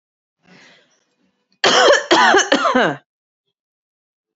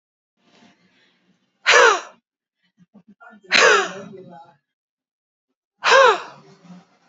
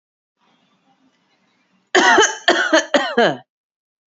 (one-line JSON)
{"cough_length": "4.4 s", "cough_amplitude": 30781, "cough_signal_mean_std_ratio": 0.43, "exhalation_length": "7.1 s", "exhalation_amplitude": 31310, "exhalation_signal_mean_std_ratio": 0.32, "three_cough_length": "4.2 s", "three_cough_amplitude": 32767, "three_cough_signal_mean_std_ratio": 0.4, "survey_phase": "alpha (2021-03-01 to 2021-08-12)", "age": "45-64", "gender": "Female", "wearing_mask": "Yes", "symptom_none": true, "smoker_status": "Current smoker (1 to 10 cigarettes per day)", "respiratory_condition_asthma": false, "respiratory_condition_other": false, "recruitment_source": "REACT", "submission_delay": "2 days", "covid_test_result": "Negative", "covid_test_method": "RT-qPCR"}